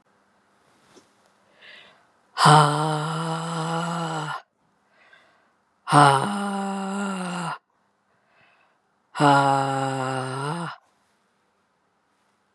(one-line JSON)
{"exhalation_length": "12.5 s", "exhalation_amplitude": 30202, "exhalation_signal_mean_std_ratio": 0.43, "survey_phase": "beta (2021-08-13 to 2022-03-07)", "age": "45-64", "gender": "Female", "wearing_mask": "No", "symptom_cough_any": true, "symptom_runny_or_blocked_nose": true, "symptom_sore_throat": true, "smoker_status": "Never smoked", "respiratory_condition_asthma": false, "respiratory_condition_other": false, "recruitment_source": "Test and Trace", "submission_delay": "2 days", "covid_test_result": "Positive", "covid_test_method": "RT-qPCR", "covid_ct_value": 23.6, "covid_ct_gene": "ORF1ab gene", "covid_ct_mean": 24.3, "covid_viral_load": "11000 copies/ml", "covid_viral_load_category": "Low viral load (10K-1M copies/ml)"}